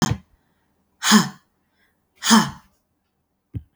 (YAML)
exhalation_length: 3.8 s
exhalation_amplitude: 32766
exhalation_signal_mean_std_ratio: 0.31
survey_phase: beta (2021-08-13 to 2022-03-07)
age: 18-44
gender: Female
wearing_mask: 'No'
symptom_cough_any: true
symptom_runny_or_blocked_nose: true
symptom_fatigue: true
symptom_change_to_sense_of_smell_or_taste: true
symptom_loss_of_taste: true
symptom_onset: 3 days
smoker_status: Never smoked
respiratory_condition_asthma: false
respiratory_condition_other: false
recruitment_source: Test and Trace
submission_delay: 2 days
covid_test_result: Positive
covid_test_method: RT-qPCR
covid_ct_value: 20.9
covid_ct_gene: S gene
covid_ct_mean: 21.6
covid_viral_load: 81000 copies/ml
covid_viral_load_category: Low viral load (10K-1M copies/ml)